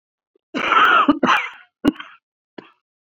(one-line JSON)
{"cough_length": "3.1 s", "cough_amplitude": 27439, "cough_signal_mean_std_ratio": 0.45, "survey_phase": "beta (2021-08-13 to 2022-03-07)", "age": "45-64", "gender": "Female", "wearing_mask": "No", "symptom_cough_any": true, "symptom_new_continuous_cough": true, "symptom_runny_or_blocked_nose": true, "symptom_shortness_of_breath": true, "symptom_fatigue": true, "symptom_headache": true, "symptom_change_to_sense_of_smell_or_taste": true, "symptom_loss_of_taste": true, "symptom_onset": "4 days", "smoker_status": "Never smoked", "respiratory_condition_asthma": true, "respiratory_condition_other": false, "recruitment_source": "Test and Trace", "submission_delay": "2 days", "covid_test_result": "Positive", "covid_test_method": "RT-qPCR", "covid_ct_value": 16.9, "covid_ct_gene": "ORF1ab gene", "covid_ct_mean": 17.2, "covid_viral_load": "2200000 copies/ml", "covid_viral_load_category": "High viral load (>1M copies/ml)"}